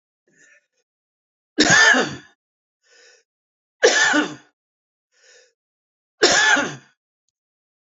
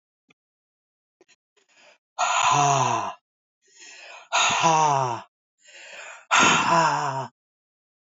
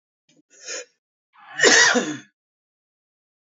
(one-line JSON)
{"three_cough_length": "7.9 s", "three_cough_amplitude": 30972, "three_cough_signal_mean_std_ratio": 0.35, "exhalation_length": "8.1 s", "exhalation_amplitude": 18044, "exhalation_signal_mean_std_ratio": 0.5, "cough_length": "3.5 s", "cough_amplitude": 27482, "cough_signal_mean_std_ratio": 0.32, "survey_phase": "alpha (2021-03-01 to 2021-08-12)", "age": "65+", "gender": "Male", "wearing_mask": "No", "symptom_cough_any": true, "symptom_new_continuous_cough": true, "symptom_fatigue": true, "symptom_onset": "4 days", "smoker_status": "Ex-smoker", "respiratory_condition_asthma": false, "respiratory_condition_other": false, "recruitment_source": "Test and Trace", "submission_delay": "2 days", "covid_test_result": "Positive", "covid_test_method": "RT-qPCR", "covid_ct_value": 16.1, "covid_ct_gene": "ORF1ab gene", "covid_ct_mean": 16.5, "covid_viral_load": "4000000 copies/ml", "covid_viral_load_category": "High viral load (>1M copies/ml)"}